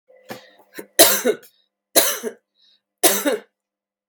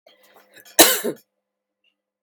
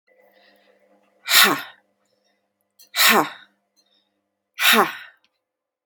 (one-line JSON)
{"three_cough_length": "4.1 s", "three_cough_amplitude": 32768, "three_cough_signal_mean_std_ratio": 0.35, "cough_length": "2.2 s", "cough_amplitude": 32768, "cough_signal_mean_std_ratio": 0.25, "exhalation_length": "5.9 s", "exhalation_amplitude": 32767, "exhalation_signal_mean_std_ratio": 0.31, "survey_phase": "beta (2021-08-13 to 2022-03-07)", "age": "18-44", "gender": "Female", "wearing_mask": "No", "symptom_cough_any": true, "symptom_runny_or_blocked_nose": true, "symptom_onset": "3 days", "smoker_status": "Never smoked", "respiratory_condition_asthma": false, "respiratory_condition_other": false, "recruitment_source": "REACT", "submission_delay": "-1 day", "covid_test_result": "Negative", "covid_test_method": "RT-qPCR", "influenza_a_test_result": "Negative", "influenza_b_test_result": "Negative"}